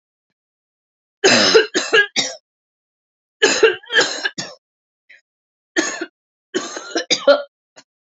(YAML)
three_cough_length: 8.2 s
three_cough_amplitude: 32768
three_cough_signal_mean_std_ratio: 0.39
survey_phase: beta (2021-08-13 to 2022-03-07)
age: 18-44
gender: Female
wearing_mask: 'No'
symptom_cough_any: true
symptom_shortness_of_breath: true
symptom_sore_throat: true
symptom_fatigue: true
smoker_status: Current smoker (e-cigarettes or vapes only)
respiratory_condition_asthma: false
respiratory_condition_other: false
recruitment_source: Test and Trace
submission_delay: 1 day
covid_test_result: Positive
covid_test_method: RT-qPCR
covid_ct_value: 21.4
covid_ct_gene: N gene
covid_ct_mean: 22.3
covid_viral_load: 50000 copies/ml
covid_viral_load_category: Low viral load (10K-1M copies/ml)